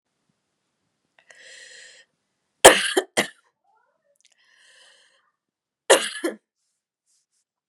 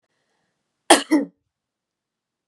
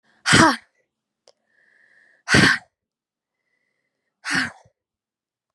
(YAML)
three_cough_length: 7.7 s
three_cough_amplitude: 32768
three_cough_signal_mean_std_ratio: 0.18
cough_length: 2.5 s
cough_amplitude: 32768
cough_signal_mean_std_ratio: 0.22
exhalation_length: 5.5 s
exhalation_amplitude: 31342
exhalation_signal_mean_std_ratio: 0.28
survey_phase: beta (2021-08-13 to 2022-03-07)
age: 18-44
gender: Female
wearing_mask: 'No'
symptom_cough_any: true
symptom_sore_throat: true
symptom_fatigue: true
symptom_change_to_sense_of_smell_or_taste: true
smoker_status: Never smoked
respiratory_condition_asthma: false
respiratory_condition_other: false
recruitment_source: Test and Trace
submission_delay: 1 day
covid_test_result: Positive
covid_test_method: RT-qPCR
covid_ct_value: 22.2
covid_ct_gene: ORF1ab gene